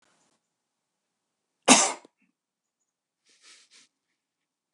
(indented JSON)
{
  "cough_length": "4.7 s",
  "cough_amplitude": 27493,
  "cough_signal_mean_std_ratio": 0.16,
  "survey_phase": "beta (2021-08-13 to 2022-03-07)",
  "age": "65+",
  "gender": "Female",
  "wearing_mask": "No",
  "symptom_none": true,
  "smoker_status": "Ex-smoker",
  "respiratory_condition_asthma": false,
  "respiratory_condition_other": false,
  "recruitment_source": "REACT",
  "submission_delay": "2 days",
  "covid_test_result": "Negative",
  "covid_test_method": "RT-qPCR"
}